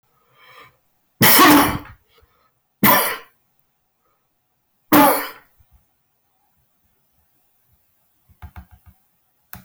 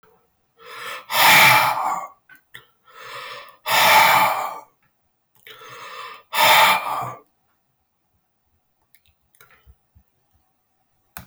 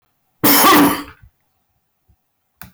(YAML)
three_cough_length: 9.6 s
three_cough_amplitude: 24672
three_cough_signal_mean_std_ratio: 0.31
exhalation_length: 11.3 s
exhalation_amplitude: 19199
exhalation_signal_mean_std_ratio: 0.4
cough_length: 2.7 s
cough_amplitude: 25319
cough_signal_mean_std_ratio: 0.43
survey_phase: beta (2021-08-13 to 2022-03-07)
age: 65+
gender: Male
wearing_mask: 'No'
symptom_cough_any: true
symptom_runny_or_blocked_nose: true
symptom_sore_throat: true
smoker_status: Never smoked
respiratory_condition_asthma: false
respiratory_condition_other: false
recruitment_source: Test and Trace
submission_delay: 1 day
covid_test_result: Positive
covid_test_method: RT-qPCR
covid_ct_value: 21.4
covid_ct_gene: ORF1ab gene
covid_ct_mean: 22.0
covid_viral_load: 62000 copies/ml
covid_viral_load_category: Low viral load (10K-1M copies/ml)